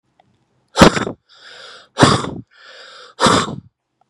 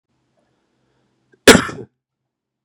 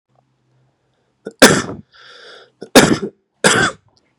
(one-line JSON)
{"exhalation_length": "4.1 s", "exhalation_amplitude": 32768, "exhalation_signal_mean_std_ratio": 0.35, "cough_length": "2.6 s", "cough_amplitude": 32768, "cough_signal_mean_std_ratio": 0.19, "three_cough_length": "4.2 s", "three_cough_amplitude": 32768, "three_cough_signal_mean_std_ratio": 0.32, "survey_phase": "beta (2021-08-13 to 2022-03-07)", "age": "18-44", "gender": "Male", "wearing_mask": "No", "symptom_cough_any": true, "symptom_runny_or_blocked_nose": true, "symptom_sore_throat": true, "smoker_status": "Never smoked", "respiratory_condition_asthma": false, "respiratory_condition_other": false, "recruitment_source": "REACT", "submission_delay": "1 day", "covid_test_result": "Negative", "covid_test_method": "RT-qPCR", "influenza_a_test_result": "Negative", "influenza_b_test_result": "Negative"}